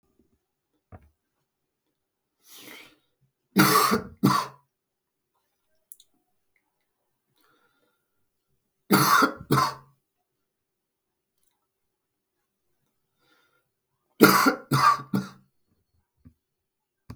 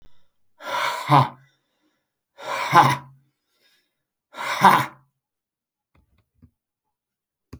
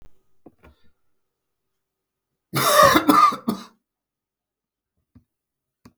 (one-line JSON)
{"three_cough_length": "17.2 s", "three_cough_amplitude": 32353, "three_cough_signal_mean_std_ratio": 0.27, "exhalation_length": "7.6 s", "exhalation_amplitude": 32595, "exhalation_signal_mean_std_ratio": 0.3, "cough_length": "6.0 s", "cough_amplitude": 32766, "cough_signal_mean_std_ratio": 0.3, "survey_phase": "beta (2021-08-13 to 2022-03-07)", "age": "45-64", "gender": "Male", "wearing_mask": "No", "symptom_none": true, "smoker_status": "Never smoked", "respiratory_condition_asthma": false, "respiratory_condition_other": false, "recruitment_source": "REACT", "submission_delay": "2 days", "covid_test_result": "Negative", "covid_test_method": "RT-qPCR"}